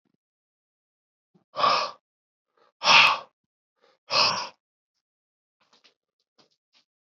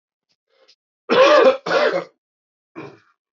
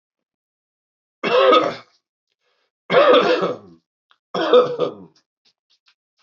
{"exhalation_length": "7.1 s", "exhalation_amplitude": 20775, "exhalation_signal_mean_std_ratio": 0.27, "cough_length": "3.3 s", "cough_amplitude": 25084, "cough_signal_mean_std_ratio": 0.41, "three_cough_length": "6.2 s", "three_cough_amplitude": 25172, "three_cough_signal_mean_std_ratio": 0.41, "survey_phase": "beta (2021-08-13 to 2022-03-07)", "age": "18-44", "gender": "Male", "wearing_mask": "No", "symptom_cough_any": true, "symptom_runny_or_blocked_nose": true, "symptom_sore_throat": true, "symptom_fatigue": true, "symptom_fever_high_temperature": true, "symptom_headache": true, "symptom_onset": "3 days", "smoker_status": "Ex-smoker", "respiratory_condition_asthma": false, "respiratory_condition_other": false, "recruitment_source": "Test and Trace", "submission_delay": "2 days", "covid_test_result": "Positive", "covid_test_method": "RT-qPCR"}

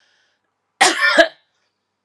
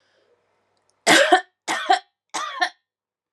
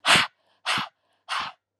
{"cough_length": "2.0 s", "cough_amplitude": 32768, "cough_signal_mean_std_ratio": 0.35, "three_cough_length": "3.3 s", "three_cough_amplitude": 29164, "three_cough_signal_mean_std_ratio": 0.36, "exhalation_length": "1.8 s", "exhalation_amplitude": 23853, "exhalation_signal_mean_std_ratio": 0.42, "survey_phase": "alpha (2021-03-01 to 2021-08-12)", "age": "18-44", "gender": "Female", "wearing_mask": "No", "symptom_fatigue": true, "smoker_status": "Never smoked", "respiratory_condition_asthma": true, "respiratory_condition_other": false, "recruitment_source": "Test and Trace", "submission_delay": "2 days", "covid_test_result": "Positive", "covid_test_method": "RT-qPCR", "covid_ct_value": 17.2, "covid_ct_gene": "N gene", "covid_ct_mean": 17.2, "covid_viral_load": "2300000 copies/ml", "covid_viral_load_category": "High viral load (>1M copies/ml)"}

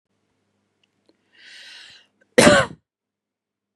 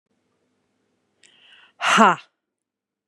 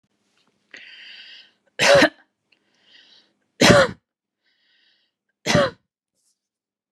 {"cough_length": "3.8 s", "cough_amplitude": 32767, "cough_signal_mean_std_ratio": 0.22, "exhalation_length": "3.1 s", "exhalation_amplitude": 32071, "exhalation_signal_mean_std_ratio": 0.24, "three_cough_length": "6.9 s", "three_cough_amplitude": 32224, "three_cough_signal_mean_std_ratio": 0.28, "survey_phase": "beta (2021-08-13 to 2022-03-07)", "age": "18-44", "gender": "Female", "wearing_mask": "No", "symptom_none": true, "smoker_status": "Ex-smoker", "respiratory_condition_asthma": false, "respiratory_condition_other": false, "recruitment_source": "REACT", "submission_delay": "1 day", "covid_test_result": "Negative", "covid_test_method": "RT-qPCR", "influenza_a_test_result": "Negative", "influenza_b_test_result": "Negative"}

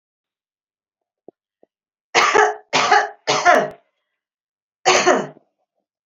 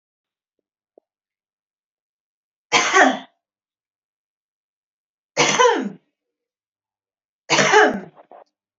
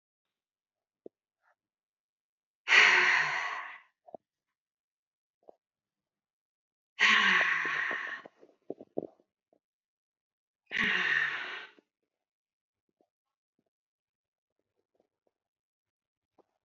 {"cough_length": "6.1 s", "cough_amplitude": 29671, "cough_signal_mean_std_ratio": 0.39, "three_cough_length": "8.8 s", "three_cough_amplitude": 28614, "three_cough_signal_mean_std_ratio": 0.31, "exhalation_length": "16.6 s", "exhalation_amplitude": 12975, "exhalation_signal_mean_std_ratio": 0.31, "survey_phase": "beta (2021-08-13 to 2022-03-07)", "age": "45-64", "gender": "Female", "wearing_mask": "Yes", "symptom_none": true, "smoker_status": "Never smoked", "respiratory_condition_asthma": false, "respiratory_condition_other": false, "recruitment_source": "REACT", "submission_delay": "3 days", "covid_test_result": "Negative", "covid_test_method": "RT-qPCR", "influenza_a_test_result": "Negative", "influenza_b_test_result": "Negative"}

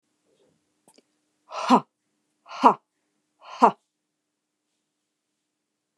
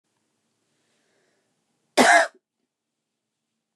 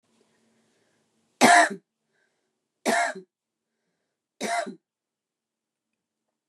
{"exhalation_length": "6.0 s", "exhalation_amplitude": 28411, "exhalation_signal_mean_std_ratio": 0.19, "cough_length": "3.8 s", "cough_amplitude": 24999, "cough_signal_mean_std_ratio": 0.22, "three_cough_length": "6.5 s", "three_cough_amplitude": 26400, "three_cough_signal_mean_std_ratio": 0.25, "survey_phase": "beta (2021-08-13 to 2022-03-07)", "age": "45-64", "gender": "Female", "wearing_mask": "No", "symptom_none": true, "smoker_status": "Never smoked", "respiratory_condition_asthma": false, "respiratory_condition_other": false, "recruitment_source": "REACT", "submission_delay": "1 day", "covid_test_result": "Negative", "covid_test_method": "RT-qPCR", "influenza_a_test_result": "Unknown/Void", "influenza_b_test_result": "Unknown/Void"}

